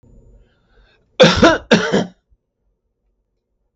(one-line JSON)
{"three_cough_length": "3.8 s", "three_cough_amplitude": 32768, "three_cough_signal_mean_std_ratio": 0.33, "survey_phase": "beta (2021-08-13 to 2022-03-07)", "age": "65+", "gender": "Male", "wearing_mask": "No", "symptom_none": true, "symptom_onset": "12 days", "smoker_status": "Never smoked", "respiratory_condition_asthma": false, "respiratory_condition_other": false, "recruitment_source": "REACT", "submission_delay": "1 day", "covid_test_result": "Negative", "covid_test_method": "RT-qPCR", "influenza_a_test_result": "Negative", "influenza_b_test_result": "Negative"}